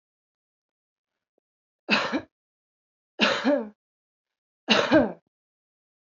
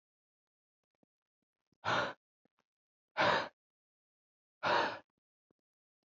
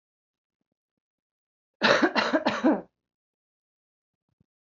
{"three_cough_length": "6.1 s", "three_cough_amplitude": 20557, "three_cough_signal_mean_std_ratio": 0.32, "exhalation_length": "6.1 s", "exhalation_amplitude": 5414, "exhalation_signal_mean_std_ratio": 0.3, "cough_length": "4.8 s", "cough_amplitude": 21142, "cough_signal_mean_std_ratio": 0.32, "survey_phase": "alpha (2021-03-01 to 2021-08-12)", "age": "18-44", "gender": "Female", "wearing_mask": "No", "symptom_fatigue": true, "symptom_headache": true, "symptom_onset": "2 days", "smoker_status": "Current smoker (11 or more cigarettes per day)", "respiratory_condition_asthma": false, "respiratory_condition_other": false, "recruitment_source": "Test and Trace", "submission_delay": "2 days", "covid_test_result": "Positive", "covid_test_method": "RT-qPCR", "covid_ct_value": 19.5, "covid_ct_gene": "ORF1ab gene", "covid_ct_mean": 20.5, "covid_viral_load": "180000 copies/ml", "covid_viral_load_category": "Low viral load (10K-1M copies/ml)"}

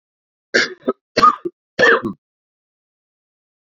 {"three_cough_length": "3.7 s", "three_cough_amplitude": 32768, "three_cough_signal_mean_std_ratio": 0.33, "survey_phase": "beta (2021-08-13 to 2022-03-07)", "age": "45-64", "gender": "Male", "wearing_mask": "No", "symptom_cough_any": true, "symptom_new_continuous_cough": true, "symptom_runny_or_blocked_nose": true, "symptom_fatigue": true, "symptom_headache": true, "symptom_change_to_sense_of_smell_or_taste": true, "symptom_loss_of_taste": true, "symptom_other": true, "symptom_onset": "4 days", "smoker_status": "Ex-smoker", "respiratory_condition_asthma": false, "respiratory_condition_other": false, "recruitment_source": "Test and Trace", "submission_delay": "2 days", "covid_test_result": "Positive", "covid_test_method": "RT-qPCR", "covid_ct_value": 17.3, "covid_ct_gene": "ORF1ab gene", "covid_ct_mean": 17.8, "covid_viral_load": "1400000 copies/ml", "covid_viral_load_category": "High viral load (>1M copies/ml)"}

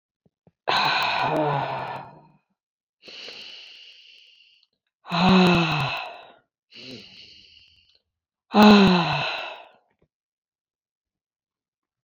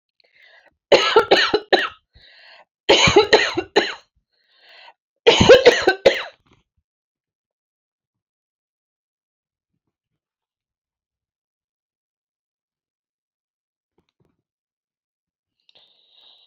{"exhalation_length": "12.0 s", "exhalation_amplitude": 27098, "exhalation_signal_mean_std_ratio": 0.39, "cough_length": "16.5 s", "cough_amplitude": 32767, "cough_signal_mean_std_ratio": 0.26, "survey_phase": "beta (2021-08-13 to 2022-03-07)", "age": "45-64", "gender": "Female", "wearing_mask": "No", "symptom_runny_or_blocked_nose": true, "symptom_shortness_of_breath": true, "smoker_status": "Never smoked", "respiratory_condition_asthma": false, "respiratory_condition_other": false, "recruitment_source": "REACT", "submission_delay": "1 day", "covid_test_result": "Negative", "covid_test_method": "RT-qPCR"}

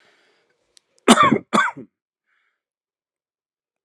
{"cough_length": "3.8 s", "cough_amplitude": 32767, "cough_signal_mean_std_ratio": 0.26, "survey_phase": "alpha (2021-03-01 to 2021-08-12)", "age": "18-44", "gender": "Male", "wearing_mask": "No", "symptom_cough_any": true, "symptom_fatigue": true, "symptom_headache": true, "smoker_status": "Never smoked", "respiratory_condition_asthma": false, "respiratory_condition_other": false, "recruitment_source": "Test and Trace", "submission_delay": "2 days", "covid_test_result": "Positive", "covid_test_method": "RT-qPCR", "covid_ct_value": 14.7, "covid_ct_gene": "ORF1ab gene", "covid_ct_mean": 14.9, "covid_viral_load": "13000000 copies/ml", "covid_viral_load_category": "High viral load (>1M copies/ml)"}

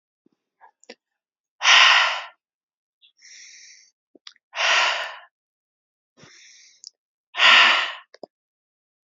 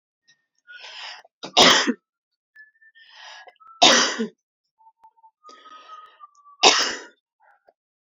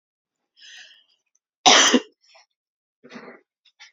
{"exhalation_length": "9.0 s", "exhalation_amplitude": 29423, "exhalation_signal_mean_std_ratio": 0.32, "three_cough_length": "8.2 s", "three_cough_amplitude": 32334, "three_cough_signal_mean_std_ratio": 0.29, "cough_length": "3.9 s", "cough_amplitude": 31644, "cough_signal_mean_std_ratio": 0.25, "survey_phase": "beta (2021-08-13 to 2022-03-07)", "age": "18-44", "gender": "Female", "wearing_mask": "No", "symptom_none": true, "smoker_status": "Never smoked", "respiratory_condition_asthma": false, "respiratory_condition_other": false, "recruitment_source": "REACT", "submission_delay": "1 day", "covid_test_result": "Negative", "covid_test_method": "RT-qPCR", "influenza_a_test_result": "Unknown/Void", "influenza_b_test_result": "Unknown/Void"}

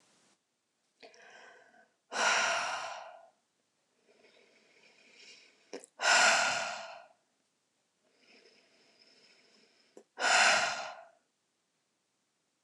{"exhalation_length": "12.6 s", "exhalation_amplitude": 8458, "exhalation_signal_mean_std_ratio": 0.34, "survey_phase": "beta (2021-08-13 to 2022-03-07)", "age": "45-64", "gender": "Female", "wearing_mask": "No", "symptom_none": true, "smoker_status": "Ex-smoker", "respiratory_condition_asthma": false, "respiratory_condition_other": false, "recruitment_source": "REACT", "submission_delay": "5 days", "covid_test_result": "Negative", "covid_test_method": "RT-qPCR", "influenza_a_test_result": "Negative", "influenza_b_test_result": "Negative"}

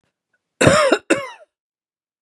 {"cough_length": "2.2 s", "cough_amplitude": 32768, "cough_signal_mean_std_ratio": 0.38, "survey_phase": "beta (2021-08-13 to 2022-03-07)", "age": "45-64", "gender": "Female", "wearing_mask": "No", "symptom_none": true, "smoker_status": "Ex-smoker", "respiratory_condition_asthma": false, "respiratory_condition_other": false, "recruitment_source": "REACT", "submission_delay": "3 days", "covid_test_result": "Negative", "covid_test_method": "RT-qPCR", "influenza_a_test_result": "Negative", "influenza_b_test_result": "Negative"}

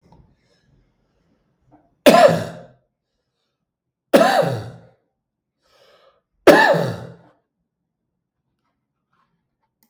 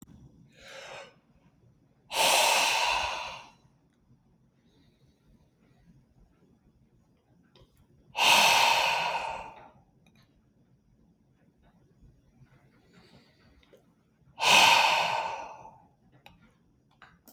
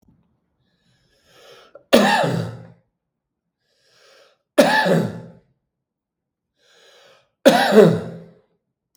{"cough_length": "9.9 s", "cough_amplitude": 32768, "cough_signal_mean_std_ratio": 0.27, "exhalation_length": "17.3 s", "exhalation_amplitude": 15293, "exhalation_signal_mean_std_ratio": 0.36, "three_cough_length": "9.0 s", "three_cough_amplitude": 32766, "three_cough_signal_mean_std_ratio": 0.33, "survey_phase": "beta (2021-08-13 to 2022-03-07)", "age": "45-64", "gender": "Male", "wearing_mask": "No", "symptom_none": true, "smoker_status": "Ex-smoker", "respiratory_condition_asthma": true, "respiratory_condition_other": false, "recruitment_source": "REACT", "submission_delay": "1 day", "covid_test_result": "Negative", "covid_test_method": "RT-qPCR", "influenza_a_test_result": "Unknown/Void", "influenza_b_test_result": "Unknown/Void"}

